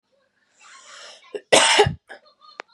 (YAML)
cough_length: 2.7 s
cough_amplitude: 31348
cough_signal_mean_std_ratio: 0.33
survey_phase: beta (2021-08-13 to 2022-03-07)
age: 18-44
gender: Female
wearing_mask: 'No'
symptom_headache: true
symptom_change_to_sense_of_smell_or_taste: true
smoker_status: Ex-smoker
respiratory_condition_asthma: false
respiratory_condition_other: false
recruitment_source: REACT
submission_delay: 2 days
covid_test_result: Negative
covid_test_method: RT-qPCR
influenza_a_test_result: Negative
influenza_b_test_result: Negative